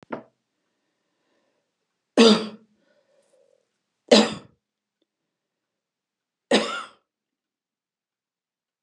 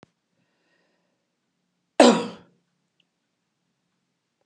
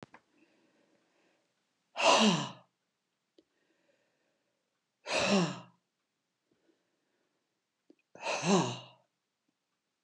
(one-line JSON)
{"three_cough_length": "8.8 s", "three_cough_amplitude": 28265, "three_cough_signal_mean_std_ratio": 0.21, "cough_length": "4.5 s", "cough_amplitude": 30515, "cough_signal_mean_std_ratio": 0.17, "exhalation_length": "10.0 s", "exhalation_amplitude": 8422, "exhalation_signal_mean_std_ratio": 0.3, "survey_phase": "beta (2021-08-13 to 2022-03-07)", "age": "65+", "gender": "Female", "wearing_mask": "No", "symptom_none": true, "smoker_status": "Never smoked", "respiratory_condition_asthma": false, "respiratory_condition_other": false, "recruitment_source": "REACT", "submission_delay": "1 day", "covid_test_result": "Negative", "covid_test_method": "RT-qPCR"}